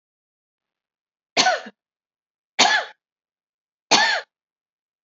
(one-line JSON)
{"three_cough_length": "5.0 s", "three_cough_amplitude": 31311, "three_cough_signal_mean_std_ratio": 0.3, "survey_phase": "beta (2021-08-13 to 2022-03-07)", "age": "45-64", "gender": "Female", "wearing_mask": "No", "symptom_headache": true, "smoker_status": "Ex-smoker", "respiratory_condition_asthma": false, "respiratory_condition_other": false, "recruitment_source": "REACT", "submission_delay": "1 day", "covid_test_result": "Negative", "covid_test_method": "RT-qPCR"}